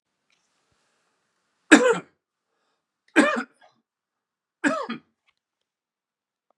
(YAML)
three_cough_length: 6.6 s
three_cough_amplitude: 32767
three_cough_signal_mean_std_ratio: 0.23
survey_phase: beta (2021-08-13 to 2022-03-07)
age: 45-64
gender: Male
wearing_mask: 'No'
symptom_cough_any: true
symptom_runny_or_blocked_nose: true
symptom_fatigue: true
symptom_change_to_sense_of_smell_or_taste: true
symptom_onset: 4 days
smoker_status: Never smoked
respiratory_condition_asthma: false
respiratory_condition_other: false
recruitment_source: Test and Trace
submission_delay: 2 days
covid_test_result: Positive
covid_test_method: RT-qPCR
covid_ct_value: 17.6
covid_ct_gene: ORF1ab gene
covid_ct_mean: 18.4
covid_viral_load: 890000 copies/ml
covid_viral_load_category: Low viral load (10K-1M copies/ml)